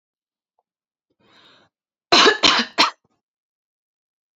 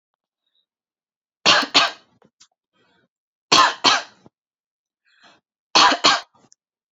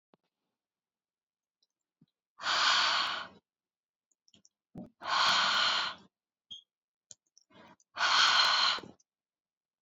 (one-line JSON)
{"cough_length": "4.4 s", "cough_amplitude": 32647, "cough_signal_mean_std_ratio": 0.28, "three_cough_length": "6.9 s", "three_cough_amplitude": 30310, "three_cough_signal_mean_std_ratio": 0.31, "exhalation_length": "9.8 s", "exhalation_amplitude": 9126, "exhalation_signal_mean_std_ratio": 0.43, "survey_phase": "beta (2021-08-13 to 2022-03-07)", "age": "18-44", "gender": "Female", "wearing_mask": "No", "symptom_none": true, "smoker_status": "Never smoked", "respiratory_condition_asthma": false, "respiratory_condition_other": false, "recruitment_source": "REACT", "submission_delay": "0 days", "covid_test_result": "Negative", "covid_test_method": "RT-qPCR", "influenza_a_test_result": "Negative", "influenza_b_test_result": "Negative"}